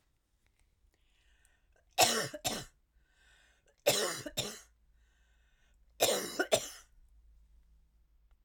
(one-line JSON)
{"three_cough_length": "8.4 s", "three_cough_amplitude": 10033, "three_cough_signal_mean_std_ratio": 0.32, "survey_phase": "alpha (2021-03-01 to 2021-08-12)", "age": "65+", "gender": "Female", "wearing_mask": "No", "symptom_none": true, "smoker_status": "Never smoked", "respiratory_condition_asthma": false, "respiratory_condition_other": false, "recruitment_source": "REACT", "submission_delay": "1 day", "covid_test_result": "Negative", "covid_test_method": "RT-qPCR"}